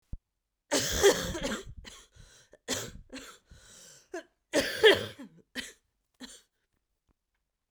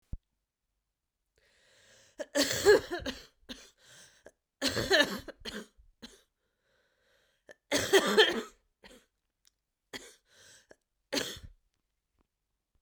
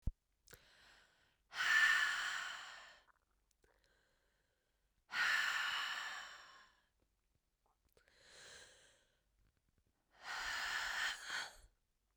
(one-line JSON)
{"cough_length": "7.7 s", "cough_amplitude": 15344, "cough_signal_mean_std_ratio": 0.33, "three_cough_length": "12.8 s", "three_cough_amplitude": 11699, "three_cough_signal_mean_std_ratio": 0.29, "exhalation_length": "12.2 s", "exhalation_amplitude": 2981, "exhalation_signal_mean_std_ratio": 0.43, "survey_phase": "beta (2021-08-13 to 2022-03-07)", "age": "18-44", "gender": "Female", "wearing_mask": "No", "symptom_cough_any": true, "symptom_shortness_of_breath": true, "symptom_sore_throat": true, "symptom_fatigue": true, "symptom_fever_high_temperature": true, "symptom_headache": true, "symptom_onset": "2 days", "smoker_status": "Never smoked", "respiratory_condition_asthma": true, "respiratory_condition_other": false, "recruitment_source": "Test and Trace", "submission_delay": "1 day", "covid_test_result": "Positive", "covid_test_method": "RT-qPCR", "covid_ct_value": 19.6, "covid_ct_gene": "ORF1ab gene", "covid_ct_mean": 19.9, "covid_viral_load": "290000 copies/ml", "covid_viral_load_category": "Low viral load (10K-1M copies/ml)"}